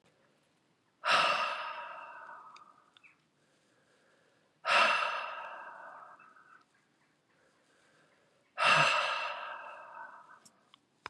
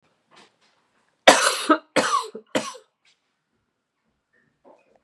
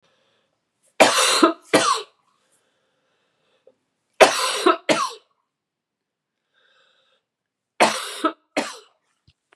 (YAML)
exhalation_length: 11.1 s
exhalation_amplitude: 7770
exhalation_signal_mean_std_ratio: 0.39
cough_length: 5.0 s
cough_amplitude: 32768
cough_signal_mean_std_ratio: 0.28
three_cough_length: 9.6 s
three_cough_amplitude: 32768
three_cough_signal_mean_std_ratio: 0.32
survey_phase: beta (2021-08-13 to 2022-03-07)
age: 45-64
gender: Female
wearing_mask: 'Yes'
symptom_cough_any: true
symptom_runny_or_blocked_nose: true
symptom_loss_of_taste: true
symptom_onset: 3 days
smoker_status: Never smoked
respiratory_condition_asthma: false
respiratory_condition_other: false
recruitment_source: Test and Trace
submission_delay: 2 days
covid_test_result: Positive
covid_test_method: ePCR